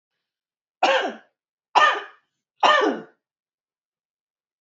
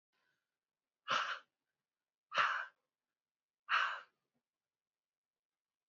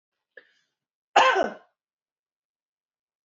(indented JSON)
{
  "three_cough_length": "4.6 s",
  "three_cough_amplitude": 27990,
  "three_cough_signal_mean_std_ratio": 0.34,
  "exhalation_length": "5.9 s",
  "exhalation_amplitude": 3414,
  "exhalation_signal_mean_std_ratio": 0.3,
  "cough_length": "3.2 s",
  "cough_amplitude": 20604,
  "cough_signal_mean_std_ratio": 0.25,
  "survey_phase": "beta (2021-08-13 to 2022-03-07)",
  "age": "45-64",
  "gender": "Female",
  "wearing_mask": "No",
  "symptom_runny_or_blocked_nose": true,
  "symptom_onset": "9 days",
  "smoker_status": "Ex-smoker",
  "respiratory_condition_asthma": false,
  "respiratory_condition_other": false,
  "recruitment_source": "REACT",
  "submission_delay": "1 day",
  "covid_test_result": "Negative",
  "covid_test_method": "RT-qPCR",
  "influenza_a_test_result": "Negative",
  "influenza_b_test_result": "Negative"
}